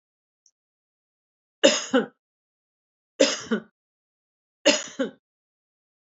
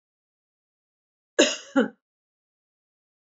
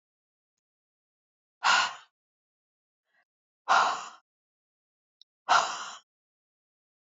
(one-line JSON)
{"three_cough_length": "6.1 s", "three_cough_amplitude": 25501, "three_cough_signal_mean_std_ratio": 0.26, "cough_length": "3.2 s", "cough_amplitude": 20143, "cough_signal_mean_std_ratio": 0.22, "exhalation_length": "7.2 s", "exhalation_amplitude": 12330, "exhalation_signal_mean_std_ratio": 0.27, "survey_phase": "beta (2021-08-13 to 2022-03-07)", "age": "65+", "gender": "Female", "wearing_mask": "No", "symptom_abdominal_pain": true, "symptom_fatigue": true, "smoker_status": "Ex-smoker", "respiratory_condition_asthma": false, "respiratory_condition_other": false, "recruitment_source": "REACT", "submission_delay": "1 day", "covid_test_result": "Negative", "covid_test_method": "RT-qPCR"}